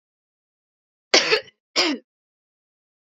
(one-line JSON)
{"cough_length": "3.1 s", "cough_amplitude": 28945, "cough_signal_mean_std_ratio": 0.28, "survey_phase": "beta (2021-08-13 to 2022-03-07)", "age": "18-44", "gender": "Female", "wearing_mask": "No", "symptom_cough_any": true, "symptom_runny_or_blocked_nose": true, "symptom_sore_throat": true, "symptom_fatigue": true, "smoker_status": "Never smoked", "respiratory_condition_asthma": false, "respiratory_condition_other": false, "recruitment_source": "Test and Trace", "submission_delay": "2 days", "covid_test_result": "Positive", "covid_test_method": "LFT"}